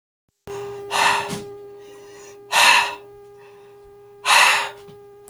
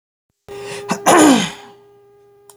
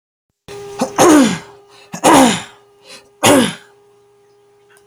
{"exhalation_length": "5.3 s", "exhalation_amplitude": 28479, "exhalation_signal_mean_std_ratio": 0.46, "cough_length": "2.6 s", "cough_amplitude": 32768, "cough_signal_mean_std_ratio": 0.41, "three_cough_length": "4.9 s", "three_cough_amplitude": 32768, "three_cough_signal_mean_std_ratio": 0.43, "survey_phase": "beta (2021-08-13 to 2022-03-07)", "age": "18-44", "gender": "Male", "wearing_mask": "No", "symptom_runny_or_blocked_nose": true, "symptom_fatigue": true, "smoker_status": "Never smoked", "respiratory_condition_asthma": false, "respiratory_condition_other": false, "recruitment_source": "Test and Trace", "submission_delay": "0 days", "covid_test_result": "Negative", "covid_test_method": "LFT"}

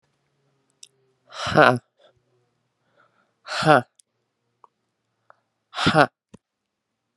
{"exhalation_length": "7.2 s", "exhalation_amplitude": 31926, "exhalation_signal_mean_std_ratio": 0.23, "survey_phase": "alpha (2021-03-01 to 2021-08-12)", "age": "18-44", "gender": "Male", "wearing_mask": "No", "symptom_fatigue": true, "symptom_headache": true, "smoker_status": "Current smoker (e-cigarettes or vapes only)", "respiratory_condition_asthma": false, "respiratory_condition_other": false, "recruitment_source": "Test and Trace", "submission_delay": "2 days", "covid_test_result": "Positive", "covid_test_method": "RT-qPCR", "covid_ct_value": 17.7, "covid_ct_gene": "ORF1ab gene"}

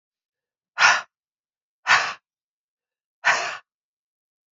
{"exhalation_length": "4.5 s", "exhalation_amplitude": 21900, "exhalation_signal_mean_std_ratio": 0.29, "survey_phase": "beta (2021-08-13 to 2022-03-07)", "age": "45-64", "gender": "Female", "wearing_mask": "No", "symptom_cough_any": true, "symptom_runny_or_blocked_nose": true, "symptom_fatigue": true, "smoker_status": "Never smoked", "respiratory_condition_asthma": false, "respiratory_condition_other": false, "recruitment_source": "Test and Trace", "submission_delay": "1 day", "covid_test_result": "Positive", "covid_test_method": "LFT"}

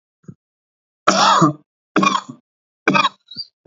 {"three_cough_length": "3.7 s", "three_cough_amplitude": 28069, "three_cough_signal_mean_std_ratio": 0.41, "survey_phase": "alpha (2021-03-01 to 2021-08-12)", "age": "45-64", "gender": "Male", "wearing_mask": "No", "symptom_none": true, "symptom_onset": "6 days", "smoker_status": "Never smoked", "respiratory_condition_asthma": false, "respiratory_condition_other": false, "recruitment_source": "REACT", "submission_delay": "1 day", "covid_test_result": "Negative", "covid_test_method": "RT-qPCR"}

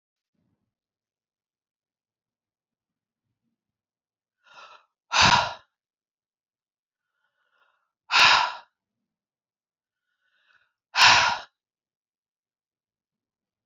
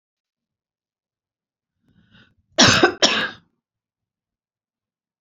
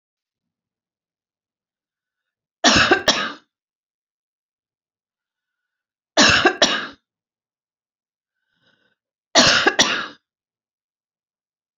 {"exhalation_length": "13.7 s", "exhalation_amplitude": 23816, "exhalation_signal_mean_std_ratio": 0.22, "cough_length": "5.2 s", "cough_amplitude": 32768, "cough_signal_mean_std_ratio": 0.25, "three_cough_length": "11.8 s", "three_cough_amplitude": 32768, "three_cough_signal_mean_std_ratio": 0.29, "survey_phase": "beta (2021-08-13 to 2022-03-07)", "age": "65+", "gender": "Female", "wearing_mask": "No", "symptom_runny_or_blocked_nose": true, "symptom_onset": "12 days", "smoker_status": "Never smoked", "respiratory_condition_asthma": false, "respiratory_condition_other": false, "recruitment_source": "REACT", "submission_delay": "3 days", "covid_test_result": "Negative", "covid_test_method": "RT-qPCR", "influenza_a_test_result": "Negative", "influenza_b_test_result": "Negative"}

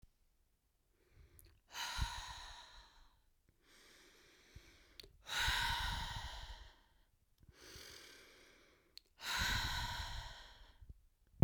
{"exhalation_length": "11.4 s", "exhalation_amplitude": 4752, "exhalation_signal_mean_std_ratio": 0.43, "survey_phase": "beta (2021-08-13 to 2022-03-07)", "age": "18-44", "gender": "Female", "wearing_mask": "No", "symptom_runny_or_blocked_nose": true, "smoker_status": "Never smoked", "respiratory_condition_asthma": false, "respiratory_condition_other": false, "recruitment_source": "Test and Trace", "submission_delay": "2 days", "covid_test_result": "Negative", "covid_test_method": "RT-qPCR"}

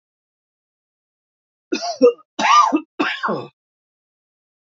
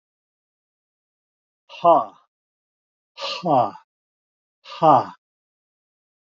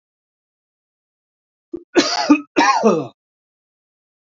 {"three_cough_length": "4.7 s", "three_cough_amplitude": 26300, "three_cough_signal_mean_std_ratio": 0.35, "exhalation_length": "6.4 s", "exhalation_amplitude": 26497, "exhalation_signal_mean_std_ratio": 0.27, "cough_length": "4.4 s", "cough_amplitude": 28729, "cough_signal_mean_std_ratio": 0.35, "survey_phase": "alpha (2021-03-01 to 2021-08-12)", "age": "65+", "gender": "Male", "wearing_mask": "No", "symptom_none": true, "smoker_status": "Ex-smoker", "respiratory_condition_asthma": true, "respiratory_condition_other": false, "recruitment_source": "REACT", "submission_delay": "2 days", "covid_test_result": "Negative", "covid_test_method": "RT-qPCR"}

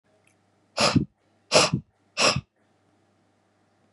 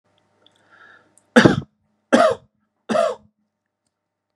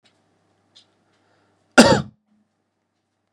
{"exhalation_length": "3.9 s", "exhalation_amplitude": 24606, "exhalation_signal_mean_std_ratio": 0.33, "three_cough_length": "4.4 s", "three_cough_amplitude": 32767, "three_cough_signal_mean_std_ratio": 0.29, "cough_length": "3.3 s", "cough_amplitude": 32768, "cough_signal_mean_std_ratio": 0.2, "survey_phase": "beta (2021-08-13 to 2022-03-07)", "age": "18-44", "gender": "Male", "wearing_mask": "No", "symptom_runny_or_blocked_nose": true, "symptom_fatigue": true, "symptom_change_to_sense_of_smell_or_taste": true, "smoker_status": "Ex-smoker", "respiratory_condition_asthma": false, "respiratory_condition_other": false, "recruitment_source": "Test and Trace", "submission_delay": "2 days", "covid_test_result": "Positive", "covid_test_method": "LFT"}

